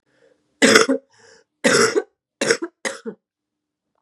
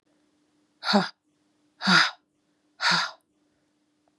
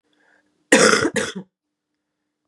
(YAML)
three_cough_length: 4.0 s
three_cough_amplitude: 32768
three_cough_signal_mean_std_ratio: 0.37
exhalation_length: 4.2 s
exhalation_amplitude: 19834
exhalation_signal_mean_std_ratio: 0.33
cough_length: 2.5 s
cough_amplitude: 32768
cough_signal_mean_std_ratio: 0.35
survey_phase: beta (2021-08-13 to 2022-03-07)
age: 18-44
gender: Female
wearing_mask: 'No'
symptom_runny_or_blocked_nose: true
symptom_sore_throat: true
symptom_headache: true
symptom_onset: 4 days
smoker_status: Never smoked
respiratory_condition_asthma: false
respiratory_condition_other: false
recruitment_source: Test and Trace
submission_delay: 2 days
covid_test_result: Positive
covid_test_method: RT-qPCR
covid_ct_value: 30.9
covid_ct_gene: ORF1ab gene
covid_ct_mean: 31.9
covid_viral_load: 35 copies/ml
covid_viral_load_category: Minimal viral load (< 10K copies/ml)